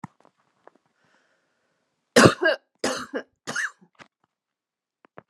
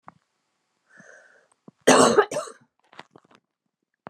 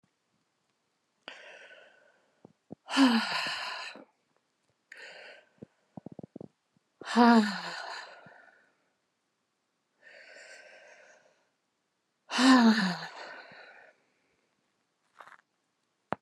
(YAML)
three_cough_length: 5.3 s
three_cough_amplitude: 31607
three_cough_signal_mean_std_ratio: 0.24
cough_length: 4.1 s
cough_amplitude: 28658
cough_signal_mean_std_ratio: 0.26
exhalation_length: 16.2 s
exhalation_amplitude: 13700
exhalation_signal_mean_std_ratio: 0.29
survey_phase: beta (2021-08-13 to 2022-03-07)
age: 45-64
gender: Female
wearing_mask: 'No'
symptom_cough_any: true
symptom_runny_or_blocked_nose: true
symptom_fatigue: true
symptom_other: true
symptom_onset: 4 days
smoker_status: Never smoked
respiratory_condition_asthma: false
respiratory_condition_other: false
recruitment_source: Test and Trace
submission_delay: 1 day
covid_test_result: Positive
covid_test_method: RT-qPCR